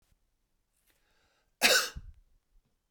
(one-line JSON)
{"cough_length": "2.9 s", "cough_amplitude": 10570, "cough_signal_mean_std_ratio": 0.25, "survey_phase": "beta (2021-08-13 to 2022-03-07)", "age": "45-64", "gender": "Male", "wearing_mask": "No", "symptom_none": true, "smoker_status": "Never smoked", "respiratory_condition_asthma": false, "respiratory_condition_other": false, "recruitment_source": "REACT", "submission_delay": "2 days", "covid_test_result": "Negative", "covid_test_method": "RT-qPCR", "influenza_a_test_result": "Negative", "influenza_b_test_result": "Negative"}